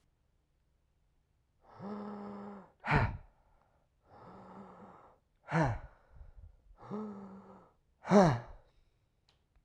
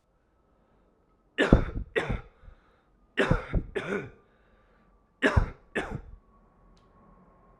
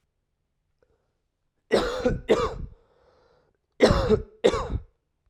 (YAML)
exhalation_length: 9.6 s
exhalation_amplitude: 8406
exhalation_signal_mean_std_ratio: 0.3
three_cough_length: 7.6 s
three_cough_amplitude: 24828
three_cough_signal_mean_std_ratio: 0.34
cough_length: 5.3 s
cough_amplitude: 19445
cough_signal_mean_std_ratio: 0.39
survey_phase: beta (2021-08-13 to 2022-03-07)
age: 18-44
gender: Male
wearing_mask: 'No'
symptom_cough_any: true
symptom_runny_or_blocked_nose: true
symptom_onset: 3 days
smoker_status: Never smoked
respiratory_condition_asthma: false
respiratory_condition_other: false
recruitment_source: Test and Trace
submission_delay: 2 days
covid_test_result: Positive
covid_test_method: RT-qPCR
covid_ct_value: 22.6
covid_ct_gene: S gene
covid_ct_mean: 23.0
covid_viral_load: 29000 copies/ml
covid_viral_load_category: Low viral load (10K-1M copies/ml)